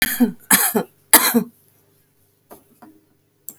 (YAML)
three_cough_length: 3.6 s
three_cough_amplitude: 32768
three_cough_signal_mean_std_ratio: 0.36
survey_phase: beta (2021-08-13 to 2022-03-07)
age: 65+
gender: Female
wearing_mask: 'No'
symptom_none: true
smoker_status: Current smoker (1 to 10 cigarettes per day)
respiratory_condition_asthma: false
respiratory_condition_other: false
recruitment_source: REACT
submission_delay: 4 days
covid_test_result: Negative
covid_test_method: RT-qPCR
influenza_a_test_result: Negative
influenza_b_test_result: Negative